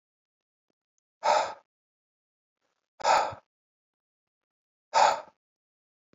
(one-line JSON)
{"exhalation_length": "6.1 s", "exhalation_amplitude": 12265, "exhalation_signal_mean_std_ratio": 0.27, "survey_phase": "beta (2021-08-13 to 2022-03-07)", "age": "45-64", "gender": "Male", "wearing_mask": "No", "symptom_cough_any": true, "symptom_runny_or_blocked_nose": true, "symptom_fatigue": true, "symptom_headache": true, "symptom_onset": "3 days", "smoker_status": "Never smoked", "respiratory_condition_asthma": false, "respiratory_condition_other": false, "recruitment_source": "Test and Trace", "submission_delay": "1 day", "covid_test_result": "Positive", "covid_test_method": "RT-qPCR", "covid_ct_value": 20.3, "covid_ct_gene": "ORF1ab gene", "covid_ct_mean": 21.2, "covid_viral_load": "110000 copies/ml", "covid_viral_load_category": "Low viral load (10K-1M copies/ml)"}